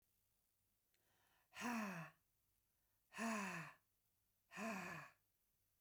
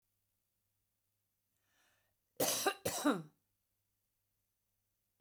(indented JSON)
{
  "exhalation_length": "5.8 s",
  "exhalation_amplitude": 619,
  "exhalation_signal_mean_std_ratio": 0.45,
  "cough_length": "5.2 s",
  "cough_amplitude": 3375,
  "cough_signal_mean_std_ratio": 0.27,
  "survey_phase": "beta (2021-08-13 to 2022-03-07)",
  "age": "45-64",
  "gender": "Female",
  "wearing_mask": "No",
  "symptom_cough_any": true,
  "symptom_headache": true,
  "symptom_onset": "7 days",
  "smoker_status": "Never smoked",
  "respiratory_condition_asthma": false,
  "respiratory_condition_other": false,
  "recruitment_source": "REACT",
  "submission_delay": "2 days",
  "covid_test_result": "Negative",
  "covid_test_method": "RT-qPCR"
}